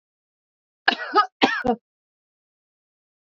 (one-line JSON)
{"cough_length": "3.3 s", "cough_amplitude": 25666, "cough_signal_mean_std_ratio": 0.28, "survey_phase": "beta (2021-08-13 to 2022-03-07)", "age": "65+", "gender": "Female", "wearing_mask": "No", "symptom_none": true, "smoker_status": "Never smoked", "respiratory_condition_asthma": false, "respiratory_condition_other": false, "recruitment_source": "REACT", "submission_delay": "2 days", "covid_test_result": "Negative", "covid_test_method": "RT-qPCR", "influenza_a_test_result": "Negative", "influenza_b_test_result": "Negative"}